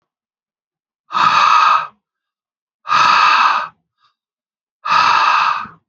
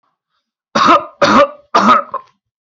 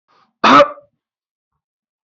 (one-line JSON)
{"exhalation_length": "5.9 s", "exhalation_amplitude": 31577, "exhalation_signal_mean_std_ratio": 0.55, "three_cough_length": "2.6 s", "three_cough_amplitude": 29652, "three_cough_signal_mean_std_ratio": 0.5, "cough_length": "2.0 s", "cough_amplitude": 28419, "cough_signal_mean_std_ratio": 0.29, "survey_phase": "beta (2021-08-13 to 2022-03-07)", "age": "18-44", "gender": "Male", "wearing_mask": "No", "symptom_none": true, "smoker_status": "Ex-smoker", "respiratory_condition_asthma": false, "respiratory_condition_other": false, "recruitment_source": "REACT", "submission_delay": "1 day", "covid_test_result": "Negative", "covid_test_method": "RT-qPCR", "influenza_a_test_result": "Negative", "influenza_b_test_result": "Negative"}